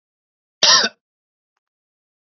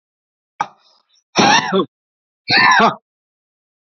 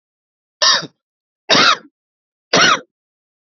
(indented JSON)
{
  "cough_length": "2.4 s",
  "cough_amplitude": 29247,
  "cough_signal_mean_std_ratio": 0.25,
  "exhalation_length": "3.9 s",
  "exhalation_amplitude": 29767,
  "exhalation_signal_mean_std_ratio": 0.4,
  "three_cough_length": "3.6 s",
  "three_cough_amplitude": 31577,
  "three_cough_signal_mean_std_ratio": 0.37,
  "survey_phase": "beta (2021-08-13 to 2022-03-07)",
  "age": "45-64",
  "gender": "Male",
  "wearing_mask": "No",
  "symptom_none": true,
  "smoker_status": "Prefer not to say",
  "recruitment_source": "REACT",
  "submission_delay": "0 days",
  "covid_test_result": "Negative",
  "covid_test_method": "RT-qPCR",
  "influenza_a_test_result": "Negative",
  "influenza_b_test_result": "Negative"
}